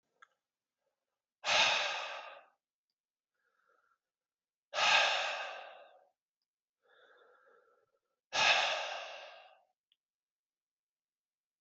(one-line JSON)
{"exhalation_length": "11.6 s", "exhalation_amplitude": 6557, "exhalation_signal_mean_std_ratio": 0.34, "survey_phase": "beta (2021-08-13 to 2022-03-07)", "age": "45-64", "gender": "Male", "wearing_mask": "No", "symptom_cough_any": true, "symptom_runny_or_blocked_nose": true, "symptom_sore_throat": true, "symptom_fatigue": true, "symptom_headache": true, "smoker_status": "Never smoked", "respiratory_condition_asthma": false, "respiratory_condition_other": false, "recruitment_source": "Test and Trace", "submission_delay": "2 days", "covid_test_result": "Positive", "covid_test_method": "RT-qPCR", "covid_ct_value": 23.1, "covid_ct_gene": "ORF1ab gene"}